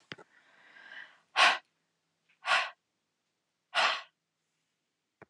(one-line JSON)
{"exhalation_length": "5.3 s", "exhalation_amplitude": 9149, "exhalation_signal_mean_std_ratio": 0.28, "survey_phase": "alpha (2021-03-01 to 2021-08-12)", "age": "65+", "gender": "Female", "wearing_mask": "No", "symptom_none": true, "smoker_status": "Never smoked", "respiratory_condition_asthma": false, "respiratory_condition_other": false, "recruitment_source": "REACT", "submission_delay": "1 day", "covid_test_result": "Negative", "covid_test_method": "RT-qPCR"}